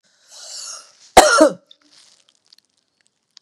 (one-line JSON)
{"cough_length": "3.4 s", "cough_amplitude": 32768, "cough_signal_mean_std_ratio": 0.27, "survey_phase": "beta (2021-08-13 to 2022-03-07)", "age": "65+", "gender": "Female", "wearing_mask": "No", "symptom_none": true, "smoker_status": "Ex-smoker", "respiratory_condition_asthma": false, "respiratory_condition_other": false, "recruitment_source": "REACT", "submission_delay": "1 day", "covid_test_result": "Negative", "covid_test_method": "RT-qPCR", "influenza_a_test_result": "Negative", "influenza_b_test_result": "Negative"}